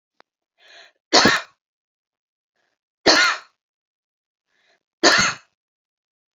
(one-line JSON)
{"three_cough_length": "6.4 s", "three_cough_amplitude": 30712, "three_cough_signal_mean_std_ratio": 0.29, "survey_phase": "beta (2021-08-13 to 2022-03-07)", "age": "45-64", "gender": "Female", "wearing_mask": "No", "symptom_none": true, "smoker_status": "Ex-smoker", "respiratory_condition_asthma": false, "respiratory_condition_other": false, "recruitment_source": "REACT", "submission_delay": "4 days", "covid_test_result": "Negative", "covid_test_method": "RT-qPCR"}